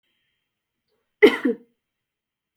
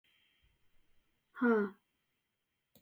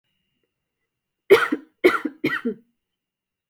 {"cough_length": "2.6 s", "cough_amplitude": 27052, "cough_signal_mean_std_ratio": 0.2, "exhalation_length": "2.8 s", "exhalation_amplitude": 3716, "exhalation_signal_mean_std_ratio": 0.27, "three_cough_length": "3.5 s", "three_cough_amplitude": 27762, "three_cough_signal_mean_std_ratio": 0.29, "survey_phase": "beta (2021-08-13 to 2022-03-07)", "age": "18-44", "gender": "Female", "wearing_mask": "No", "symptom_none": true, "smoker_status": "Never smoked", "respiratory_condition_asthma": false, "respiratory_condition_other": false, "recruitment_source": "REACT", "submission_delay": "3 days", "covid_test_result": "Negative", "covid_test_method": "RT-qPCR"}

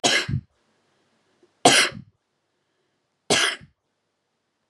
{"three_cough_length": "4.7 s", "three_cough_amplitude": 30862, "three_cough_signal_mean_std_ratio": 0.31, "survey_phase": "beta (2021-08-13 to 2022-03-07)", "age": "18-44", "gender": "Female", "wearing_mask": "No", "symptom_none": true, "smoker_status": "Never smoked", "respiratory_condition_asthma": true, "respiratory_condition_other": false, "recruitment_source": "REACT", "submission_delay": "2 days", "covid_test_result": "Negative", "covid_test_method": "RT-qPCR"}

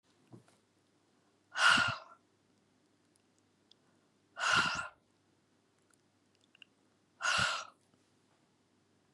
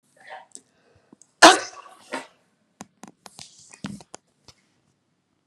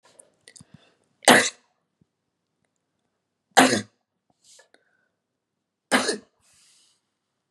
{"exhalation_length": "9.1 s", "exhalation_amplitude": 6958, "exhalation_signal_mean_std_ratio": 0.3, "cough_length": "5.5 s", "cough_amplitude": 32768, "cough_signal_mean_std_ratio": 0.16, "three_cough_length": "7.5 s", "three_cough_amplitude": 31403, "three_cough_signal_mean_std_ratio": 0.21, "survey_phase": "beta (2021-08-13 to 2022-03-07)", "age": "45-64", "gender": "Female", "wearing_mask": "No", "symptom_none": true, "smoker_status": "Ex-smoker", "respiratory_condition_asthma": false, "respiratory_condition_other": false, "recruitment_source": "REACT", "submission_delay": "1 day", "covid_test_result": "Negative", "covid_test_method": "RT-qPCR", "influenza_a_test_result": "Negative", "influenza_b_test_result": "Negative"}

